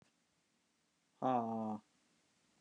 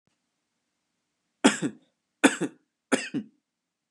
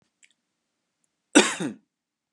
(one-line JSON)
{"exhalation_length": "2.6 s", "exhalation_amplitude": 2176, "exhalation_signal_mean_std_ratio": 0.38, "three_cough_length": "3.9 s", "three_cough_amplitude": 21527, "three_cough_signal_mean_std_ratio": 0.25, "cough_length": "2.3 s", "cough_amplitude": 25614, "cough_signal_mean_std_ratio": 0.22, "survey_phase": "beta (2021-08-13 to 2022-03-07)", "age": "18-44", "gender": "Male", "wearing_mask": "No", "symptom_none": true, "smoker_status": "Never smoked", "respiratory_condition_asthma": false, "respiratory_condition_other": false, "recruitment_source": "REACT", "submission_delay": "2 days", "covid_test_result": "Negative", "covid_test_method": "RT-qPCR", "influenza_a_test_result": "Unknown/Void", "influenza_b_test_result": "Unknown/Void"}